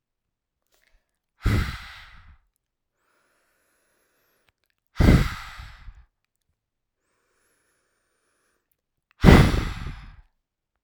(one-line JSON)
{"exhalation_length": "10.8 s", "exhalation_amplitude": 32768, "exhalation_signal_mean_std_ratio": 0.24, "survey_phase": "alpha (2021-03-01 to 2021-08-12)", "age": "18-44", "gender": "Female", "wearing_mask": "No", "symptom_cough_any": true, "symptom_new_continuous_cough": true, "symptom_fatigue": true, "symptom_headache": true, "symptom_change_to_sense_of_smell_or_taste": true, "symptom_onset": "2 days", "smoker_status": "Never smoked", "respiratory_condition_asthma": false, "respiratory_condition_other": false, "recruitment_source": "Test and Trace", "submission_delay": "2 days", "covid_test_result": "Positive", "covid_test_method": "RT-qPCR", "covid_ct_value": 18.3, "covid_ct_gene": "ORF1ab gene", "covid_ct_mean": 19.4, "covid_viral_load": "430000 copies/ml", "covid_viral_load_category": "Low viral load (10K-1M copies/ml)"}